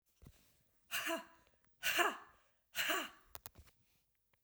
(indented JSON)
{
  "exhalation_length": "4.4 s",
  "exhalation_amplitude": 4094,
  "exhalation_signal_mean_std_ratio": 0.38,
  "survey_phase": "beta (2021-08-13 to 2022-03-07)",
  "age": "45-64",
  "gender": "Female",
  "wearing_mask": "No",
  "symptom_runny_or_blocked_nose": true,
  "smoker_status": "Never smoked",
  "respiratory_condition_asthma": false,
  "respiratory_condition_other": false,
  "recruitment_source": "Test and Trace",
  "submission_delay": "2 days",
  "covid_test_result": "Positive",
  "covid_test_method": "RT-qPCR",
  "covid_ct_value": 27.1,
  "covid_ct_gene": "N gene"
}